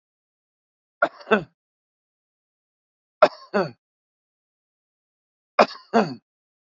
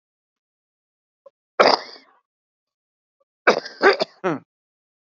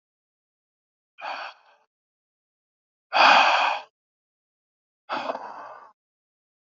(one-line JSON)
{"three_cough_length": "6.7 s", "three_cough_amplitude": 27990, "three_cough_signal_mean_std_ratio": 0.2, "cough_length": "5.1 s", "cough_amplitude": 28022, "cough_signal_mean_std_ratio": 0.25, "exhalation_length": "6.7 s", "exhalation_amplitude": 20700, "exhalation_signal_mean_std_ratio": 0.29, "survey_phase": "alpha (2021-03-01 to 2021-08-12)", "age": "45-64", "gender": "Male", "wearing_mask": "No", "symptom_shortness_of_breath": true, "symptom_loss_of_taste": true, "smoker_status": "Current smoker (1 to 10 cigarettes per day)", "respiratory_condition_asthma": false, "respiratory_condition_other": false, "recruitment_source": "REACT", "submission_delay": "10 days", "covid_test_result": "Negative", "covid_test_method": "RT-qPCR"}